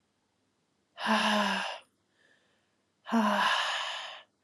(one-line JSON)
{"exhalation_length": "4.4 s", "exhalation_amplitude": 7213, "exhalation_signal_mean_std_ratio": 0.53, "survey_phase": "alpha (2021-03-01 to 2021-08-12)", "age": "18-44", "gender": "Female", "wearing_mask": "No", "symptom_fatigue": true, "symptom_change_to_sense_of_smell_or_taste": true, "symptom_loss_of_taste": true, "symptom_onset": "5 days", "smoker_status": "Current smoker (1 to 10 cigarettes per day)", "respiratory_condition_asthma": false, "respiratory_condition_other": false, "recruitment_source": "Test and Trace", "submission_delay": "3 days", "covid_test_result": "Positive", "covid_test_method": "RT-qPCR", "covid_ct_value": 19.6, "covid_ct_gene": "ORF1ab gene", "covid_ct_mean": 19.7, "covid_viral_load": "340000 copies/ml", "covid_viral_load_category": "Low viral load (10K-1M copies/ml)"}